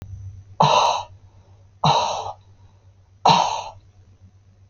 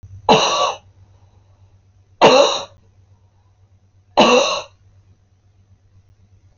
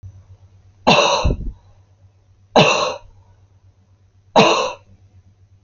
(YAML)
exhalation_length: 4.7 s
exhalation_amplitude: 28572
exhalation_signal_mean_std_ratio: 0.44
cough_length: 6.6 s
cough_amplitude: 29525
cough_signal_mean_std_ratio: 0.36
three_cough_length: 5.6 s
three_cough_amplitude: 29559
three_cough_signal_mean_std_ratio: 0.4
survey_phase: alpha (2021-03-01 to 2021-08-12)
age: 45-64
gender: Female
wearing_mask: 'No'
symptom_none: true
smoker_status: Never smoked
respiratory_condition_asthma: false
respiratory_condition_other: false
recruitment_source: REACT
submission_delay: 2 days
covid_test_result: Negative
covid_test_method: RT-qPCR